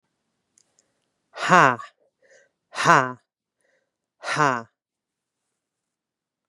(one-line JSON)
{"exhalation_length": "6.5 s", "exhalation_amplitude": 32715, "exhalation_signal_mean_std_ratio": 0.24, "survey_phase": "beta (2021-08-13 to 2022-03-07)", "age": "45-64", "gender": "Female", "wearing_mask": "No", "symptom_cough_any": true, "symptom_runny_or_blocked_nose": true, "symptom_sore_throat": true, "symptom_abdominal_pain": true, "symptom_diarrhoea": true, "symptom_fatigue": true, "symptom_other": true, "symptom_onset": "3 days", "smoker_status": "Ex-smoker", "respiratory_condition_asthma": false, "respiratory_condition_other": false, "recruitment_source": "Test and Trace", "submission_delay": "1 day", "covid_test_result": "Positive", "covid_test_method": "ePCR"}